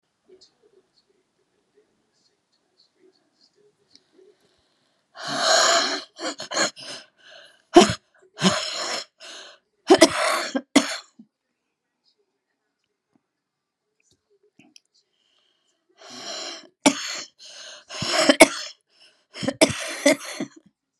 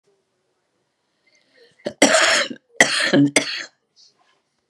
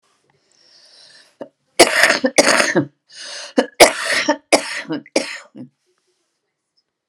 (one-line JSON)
{"exhalation_length": "21.0 s", "exhalation_amplitude": 32768, "exhalation_signal_mean_std_ratio": 0.29, "cough_length": "4.7 s", "cough_amplitude": 32768, "cough_signal_mean_std_ratio": 0.38, "three_cough_length": "7.1 s", "three_cough_amplitude": 32768, "three_cough_signal_mean_std_ratio": 0.37, "survey_phase": "beta (2021-08-13 to 2022-03-07)", "age": "65+", "gender": "Female", "wearing_mask": "No", "symptom_cough_any": true, "symptom_new_continuous_cough": true, "symptom_shortness_of_breath": true, "symptom_fever_high_temperature": true, "symptom_onset": "2 days", "smoker_status": "Never smoked", "respiratory_condition_asthma": false, "respiratory_condition_other": true, "recruitment_source": "Test and Trace", "submission_delay": "2 days", "covid_test_result": "Positive", "covid_test_method": "LAMP"}